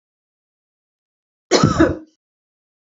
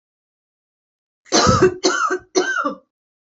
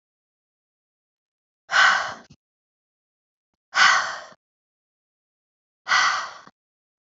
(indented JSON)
{
  "cough_length": "2.9 s",
  "cough_amplitude": 28222,
  "cough_signal_mean_std_ratio": 0.29,
  "three_cough_length": "3.2 s",
  "three_cough_amplitude": 28117,
  "three_cough_signal_mean_std_ratio": 0.47,
  "exhalation_length": "7.1 s",
  "exhalation_amplitude": 23398,
  "exhalation_signal_mean_std_ratio": 0.31,
  "survey_phase": "beta (2021-08-13 to 2022-03-07)",
  "age": "18-44",
  "gender": "Female",
  "wearing_mask": "No",
  "symptom_none": true,
  "smoker_status": "Never smoked",
  "respiratory_condition_asthma": false,
  "respiratory_condition_other": false,
  "recruitment_source": "REACT",
  "submission_delay": "1 day",
  "covid_test_result": "Negative",
  "covid_test_method": "RT-qPCR",
  "influenza_a_test_result": "Negative",
  "influenza_b_test_result": "Negative"
}